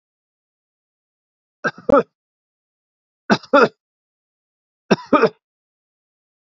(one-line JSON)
{"three_cough_length": "6.6 s", "three_cough_amplitude": 28701, "three_cough_signal_mean_std_ratio": 0.23, "survey_phase": "beta (2021-08-13 to 2022-03-07)", "age": "65+", "gender": "Male", "wearing_mask": "No", "symptom_none": true, "smoker_status": "Never smoked", "respiratory_condition_asthma": false, "respiratory_condition_other": false, "recruitment_source": "REACT", "submission_delay": "2 days", "covid_test_result": "Negative", "covid_test_method": "RT-qPCR", "influenza_a_test_result": "Negative", "influenza_b_test_result": "Negative"}